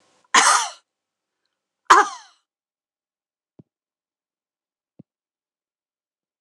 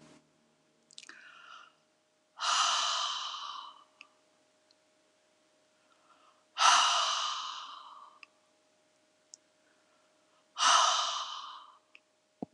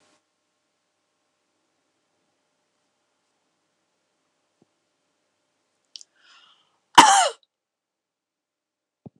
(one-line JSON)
{"three_cough_length": "6.4 s", "three_cough_amplitude": 26028, "three_cough_signal_mean_std_ratio": 0.21, "exhalation_length": "12.5 s", "exhalation_amplitude": 12054, "exhalation_signal_mean_std_ratio": 0.38, "cough_length": "9.2 s", "cough_amplitude": 26028, "cough_signal_mean_std_ratio": 0.14, "survey_phase": "alpha (2021-03-01 to 2021-08-12)", "age": "65+", "gender": "Female", "wearing_mask": "No", "symptom_none": true, "smoker_status": "Never smoked", "respiratory_condition_asthma": false, "respiratory_condition_other": false, "recruitment_source": "REACT", "submission_delay": "1 day", "covid_test_result": "Negative", "covid_test_method": "RT-qPCR"}